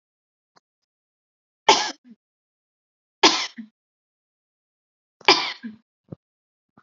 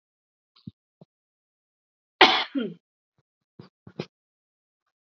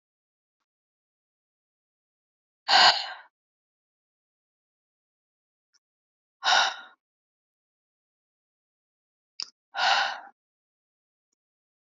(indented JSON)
{
  "three_cough_length": "6.8 s",
  "three_cough_amplitude": 31619,
  "three_cough_signal_mean_std_ratio": 0.21,
  "cough_length": "5.0 s",
  "cough_amplitude": 28071,
  "cough_signal_mean_std_ratio": 0.18,
  "exhalation_length": "11.9 s",
  "exhalation_amplitude": 18149,
  "exhalation_signal_mean_std_ratio": 0.22,
  "survey_phase": "beta (2021-08-13 to 2022-03-07)",
  "age": "18-44",
  "gender": "Female",
  "wearing_mask": "No",
  "symptom_none": true,
  "smoker_status": "Never smoked",
  "respiratory_condition_asthma": false,
  "respiratory_condition_other": false,
  "recruitment_source": "REACT",
  "submission_delay": "3 days",
  "covid_test_result": "Negative",
  "covid_test_method": "RT-qPCR",
  "influenza_a_test_result": "Negative",
  "influenza_b_test_result": "Negative"
}